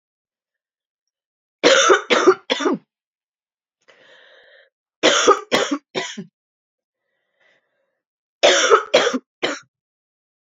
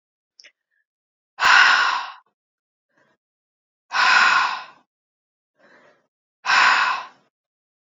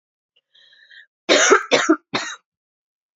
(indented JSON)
{
  "three_cough_length": "10.5 s",
  "three_cough_amplitude": 28999,
  "three_cough_signal_mean_std_ratio": 0.36,
  "exhalation_length": "7.9 s",
  "exhalation_amplitude": 26703,
  "exhalation_signal_mean_std_ratio": 0.39,
  "cough_length": "3.2 s",
  "cough_amplitude": 28028,
  "cough_signal_mean_std_ratio": 0.36,
  "survey_phase": "beta (2021-08-13 to 2022-03-07)",
  "age": "18-44",
  "gender": "Female",
  "wearing_mask": "No",
  "symptom_cough_any": true,
  "symptom_fatigue": true,
  "symptom_headache": true,
  "symptom_onset": "3 days",
  "smoker_status": "Never smoked",
  "respiratory_condition_asthma": false,
  "respiratory_condition_other": false,
  "recruitment_source": "Test and Trace",
  "submission_delay": "2 days",
  "covid_test_result": "Positive",
  "covid_test_method": "RT-qPCR",
  "covid_ct_value": 23.3,
  "covid_ct_gene": "N gene"
}